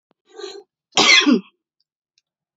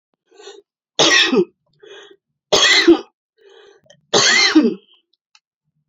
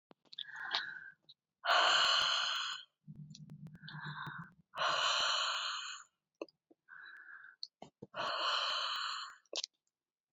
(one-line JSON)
{"cough_length": "2.6 s", "cough_amplitude": 31676, "cough_signal_mean_std_ratio": 0.35, "three_cough_length": "5.9 s", "three_cough_amplitude": 30073, "three_cough_signal_mean_std_ratio": 0.43, "exhalation_length": "10.3 s", "exhalation_amplitude": 6118, "exhalation_signal_mean_std_ratio": 0.56, "survey_phase": "beta (2021-08-13 to 2022-03-07)", "age": "45-64", "gender": "Female", "wearing_mask": "No", "symptom_runny_or_blocked_nose": true, "symptom_fatigue": true, "symptom_headache": true, "symptom_loss_of_taste": true, "symptom_onset": "12 days", "smoker_status": "Current smoker (e-cigarettes or vapes only)", "respiratory_condition_asthma": false, "respiratory_condition_other": false, "recruitment_source": "REACT", "submission_delay": "2 days", "covid_test_result": "Negative", "covid_test_method": "RT-qPCR"}